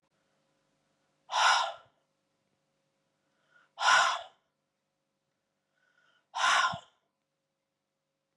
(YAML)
exhalation_length: 8.4 s
exhalation_amplitude: 8548
exhalation_signal_mean_std_ratio: 0.3
survey_phase: beta (2021-08-13 to 2022-03-07)
age: 65+
gender: Female
wearing_mask: 'No'
symptom_none: true
smoker_status: Never smoked
respiratory_condition_asthma: false
respiratory_condition_other: true
recruitment_source: REACT
submission_delay: 4 days
covid_test_result: Negative
covid_test_method: RT-qPCR